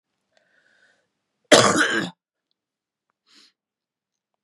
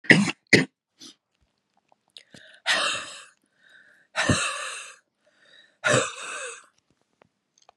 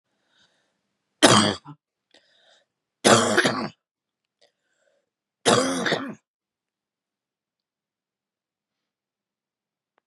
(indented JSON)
{
  "cough_length": "4.4 s",
  "cough_amplitude": 32767,
  "cough_signal_mean_std_ratio": 0.25,
  "exhalation_length": "7.8 s",
  "exhalation_amplitude": 31816,
  "exhalation_signal_mean_std_ratio": 0.33,
  "three_cough_length": "10.1 s",
  "three_cough_amplitude": 32767,
  "three_cough_signal_mean_std_ratio": 0.28,
  "survey_phase": "beta (2021-08-13 to 2022-03-07)",
  "age": "45-64",
  "gender": "Female",
  "wearing_mask": "No",
  "symptom_cough_any": true,
  "symptom_sore_throat": true,
  "symptom_fatigue": true,
  "symptom_headache": true,
  "smoker_status": "Ex-smoker",
  "respiratory_condition_asthma": false,
  "respiratory_condition_other": true,
  "recruitment_source": "Test and Trace",
  "submission_delay": "1 day",
  "covid_test_result": "Positive",
  "covid_test_method": "LFT"
}